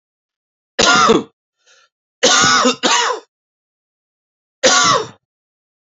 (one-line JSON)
{"cough_length": "5.8 s", "cough_amplitude": 32767, "cough_signal_mean_std_ratio": 0.46, "survey_phase": "beta (2021-08-13 to 2022-03-07)", "age": "45-64", "gender": "Male", "wearing_mask": "No", "symptom_none": true, "smoker_status": "Never smoked", "respiratory_condition_asthma": false, "respiratory_condition_other": false, "recruitment_source": "Test and Trace", "submission_delay": "2 days", "covid_test_result": "Positive", "covid_test_method": "ePCR"}